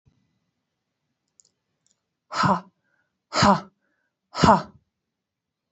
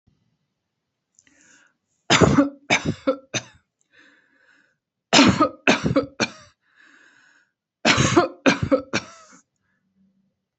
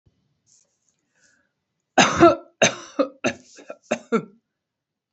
{
  "exhalation_length": "5.7 s",
  "exhalation_amplitude": 26627,
  "exhalation_signal_mean_std_ratio": 0.27,
  "three_cough_length": "10.6 s",
  "three_cough_amplitude": 32767,
  "three_cough_signal_mean_std_ratio": 0.35,
  "cough_length": "5.1 s",
  "cough_amplitude": 28428,
  "cough_signal_mean_std_ratio": 0.29,
  "survey_phase": "beta (2021-08-13 to 2022-03-07)",
  "age": "45-64",
  "gender": "Female",
  "wearing_mask": "No",
  "symptom_none": true,
  "smoker_status": "Never smoked",
  "respiratory_condition_asthma": false,
  "respiratory_condition_other": false,
  "recruitment_source": "REACT",
  "submission_delay": "0 days",
  "covid_test_result": "Negative",
  "covid_test_method": "RT-qPCR"
}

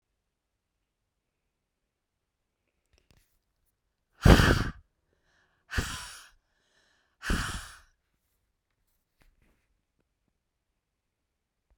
{
  "exhalation_length": "11.8 s",
  "exhalation_amplitude": 29150,
  "exhalation_signal_mean_std_ratio": 0.18,
  "survey_phase": "beta (2021-08-13 to 2022-03-07)",
  "age": "45-64",
  "gender": "Female",
  "wearing_mask": "No",
  "symptom_none": true,
  "smoker_status": "Never smoked",
  "respiratory_condition_asthma": false,
  "respiratory_condition_other": false,
  "recruitment_source": "REACT",
  "submission_delay": "1 day",
  "covid_test_result": "Negative",
  "covid_test_method": "RT-qPCR"
}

